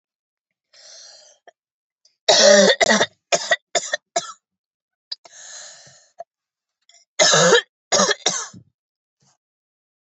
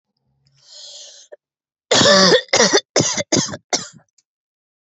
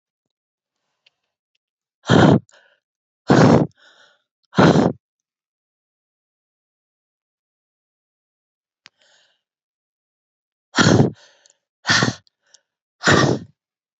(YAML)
three_cough_length: 10.1 s
three_cough_amplitude: 28672
three_cough_signal_mean_std_ratio: 0.35
cough_length: 4.9 s
cough_amplitude: 32364
cough_signal_mean_std_ratio: 0.42
exhalation_length: 14.0 s
exhalation_amplitude: 29903
exhalation_signal_mean_std_ratio: 0.29
survey_phase: beta (2021-08-13 to 2022-03-07)
age: 18-44
gender: Female
wearing_mask: 'No'
symptom_cough_any: true
symptom_runny_or_blocked_nose: true
symptom_shortness_of_breath: true
symptom_sore_throat: true
symptom_onset: 12 days
smoker_status: Ex-smoker
respiratory_condition_asthma: false
respiratory_condition_other: false
recruitment_source: REACT
submission_delay: 2 days
covid_test_result: Negative
covid_test_method: RT-qPCR
influenza_a_test_result: Negative
influenza_b_test_result: Negative